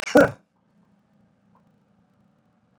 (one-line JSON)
{"cough_length": "2.8 s", "cough_amplitude": 23911, "cough_signal_mean_std_ratio": 0.19, "survey_phase": "beta (2021-08-13 to 2022-03-07)", "age": "45-64", "gender": "Male", "wearing_mask": "No", "symptom_none": true, "smoker_status": "Never smoked", "respiratory_condition_asthma": false, "respiratory_condition_other": false, "recruitment_source": "Test and Trace", "submission_delay": "1 day", "covid_test_result": "Negative", "covid_test_method": "RT-qPCR"}